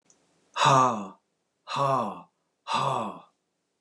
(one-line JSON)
{"exhalation_length": "3.8 s", "exhalation_amplitude": 13613, "exhalation_signal_mean_std_ratio": 0.46, "survey_phase": "beta (2021-08-13 to 2022-03-07)", "age": "65+", "gender": "Male", "wearing_mask": "No", "symptom_none": true, "smoker_status": "Never smoked", "respiratory_condition_asthma": false, "respiratory_condition_other": false, "recruitment_source": "REACT", "submission_delay": "5 days", "covid_test_result": "Negative", "covid_test_method": "RT-qPCR", "influenza_a_test_result": "Negative", "influenza_b_test_result": "Negative"}